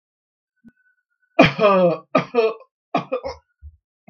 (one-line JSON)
{"three_cough_length": "4.1 s", "three_cough_amplitude": 32768, "three_cough_signal_mean_std_ratio": 0.39, "survey_phase": "beta (2021-08-13 to 2022-03-07)", "age": "45-64", "gender": "Male", "wearing_mask": "No", "symptom_none": true, "smoker_status": "Ex-smoker", "respiratory_condition_asthma": false, "respiratory_condition_other": false, "recruitment_source": "REACT", "submission_delay": "4 days", "covid_test_result": "Negative", "covid_test_method": "RT-qPCR"}